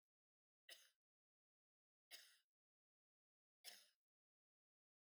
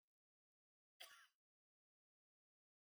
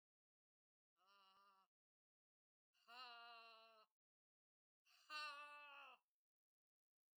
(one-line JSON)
{"three_cough_length": "5.0 s", "three_cough_amplitude": 227, "three_cough_signal_mean_std_ratio": 0.24, "cough_length": "2.9 s", "cough_amplitude": 224, "cough_signal_mean_std_ratio": 0.21, "exhalation_length": "7.2 s", "exhalation_amplitude": 348, "exhalation_signal_mean_std_ratio": 0.38, "survey_phase": "beta (2021-08-13 to 2022-03-07)", "age": "65+", "gender": "Female", "wearing_mask": "No", "symptom_runny_or_blocked_nose": true, "smoker_status": "Ex-smoker", "respiratory_condition_asthma": false, "respiratory_condition_other": false, "recruitment_source": "REACT", "submission_delay": "2 days", "covid_test_result": "Negative", "covid_test_method": "RT-qPCR", "influenza_a_test_result": "Negative", "influenza_b_test_result": "Negative"}